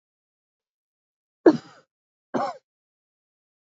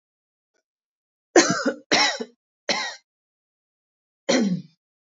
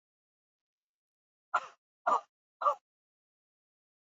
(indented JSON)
{
  "cough_length": "3.8 s",
  "cough_amplitude": 26876,
  "cough_signal_mean_std_ratio": 0.17,
  "three_cough_length": "5.1 s",
  "three_cough_amplitude": 26616,
  "three_cough_signal_mean_std_ratio": 0.35,
  "exhalation_length": "4.0 s",
  "exhalation_amplitude": 4986,
  "exhalation_signal_mean_std_ratio": 0.22,
  "survey_phase": "beta (2021-08-13 to 2022-03-07)",
  "age": "18-44",
  "gender": "Female",
  "wearing_mask": "No",
  "symptom_runny_or_blocked_nose": true,
  "symptom_sore_throat": true,
  "symptom_headache": true,
  "symptom_onset": "5 days",
  "smoker_status": "Never smoked",
  "respiratory_condition_asthma": true,
  "respiratory_condition_other": false,
  "recruitment_source": "Test and Trace",
  "submission_delay": "2 days",
  "covid_test_result": "Positive",
  "covid_test_method": "RT-qPCR",
  "covid_ct_value": 32.7,
  "covid_ct_gene": "N gene"
}